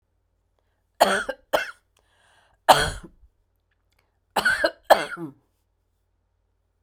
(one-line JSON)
{"three_cough_length": "6.8 s", "three_cough_amplitude": 32768, "three_cough_signal_mean_std_ratio": 0.28, "survey_phase": "beta (2021-08-13 to 2022-03-07)", "age": "45-64", "gender": "Female", "wearing_mask": "No", "symptom_none": true, "smoker_status": "Ex-smoker", "respiratory_condition_asthma": false, "respiratory_condition_other": false, "recruitment_source": "REACT", "submission_delay": "2 days", "covid_test_result": "Negative", "covid_test_method": "RT-qPCR"}